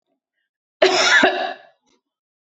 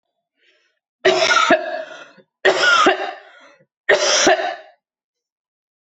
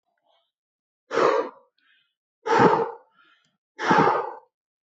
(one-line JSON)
{"cough_length": "2.6 s", "cough_amplitude": 25562, "cough_signal_mean_std_ratio": 0.41, "three_cough_length": "5.8 s", "three_cough_amplitude": 26398, "three_cough_signal_mean_std_ratio": 0.49, "exhalation_length": "4.9 s", "exhalation_amplitude": 22126, "exhalation_signal_mean_std_ratio": 0.4, "survey_phase": "beta (2021-08-13 to 2022-03-07)", "age": "45-64", "gender": "Female", "wearing_mask": "No", "symptom_fatigue": true, "smoker_status": "Prefer not to say", "respiratory_condition_asthma": false, "respiratory_condition_other": false, "recruitment_source": "REACT", "submission_delay": "2 days", "covid_test_result": "Negative", "covid_test_method": "RT-qPCR"}